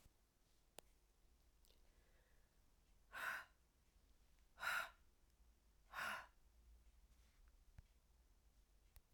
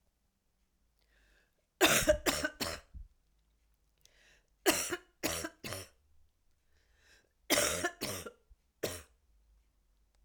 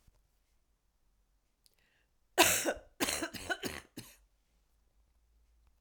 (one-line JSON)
{"exhalation_length": "9.1 s", "exhalation_amplitude": 728, "exhalation_signal_mean_std_ratio": 0.37, "three_cough_length": "10.2 s", "three_cough_amplitude": 9387, "three_cough_signal_mean_std_ratio": 0.33, "cough_length": "5.8 s", "cough_amplitude": 13836, "cough_signal_mean_std_ratio": 0.28, "survey_phase": "beta (2021-08-13 to 2022-03-07)", "age": "45-64", "gender": "Female", "wearing_mask": "No", "symptom_cough_any": true, "symptom_runny_or_blocked_nose": true, "symptom_sore_throat": true, "symptom_fatigue": true, "symptom_fever_high_temperature": true, "symptom_headache": true, "symptom_onset": "3 days", "smoker_status": "Never smoked", "respiratory_condition_asthma": false, "respiratory_condition_other": false, "recruitment_source": "Test and Trace", "submission_delay": "2 days", "covid_test_result": "Positive", "covid_test_method": "RT-qPCR", "covid_ct_value": 20.7, "covid_ct_gene": "S gene", "covid_ct_mean": 22.0, "covid_viral_load": "63000 copies/ml", "covid_viral_load_category": "Low viral load (10K-1M copies/ml)"}